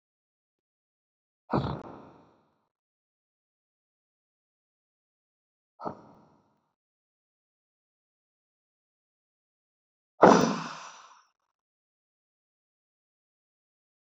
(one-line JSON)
{"exhalation_length": "14.2 s", "exhalation_amplitude": 20024, "exhalation_signal_mean_std_ratio": 0.15, "survey_phase": "beta (2021-08-13 to 2022-03-07)", "age": "18-44", "gender": "Male", "wearing_mask": "No", "symptom_cough_any": true, "symptom_new_continuous_cough": true, "symptom_fatigue": true, "symptom_headache": true, "smoker_status": "Ex-smoker", "respiratory_condition_asthma": false, "respiratory_condition_other": false, "recruitment_source": "Test and Trace", "submission_delay": "1 day", "covid_test_result": "Positive", "covid_test_method": "ePCR"}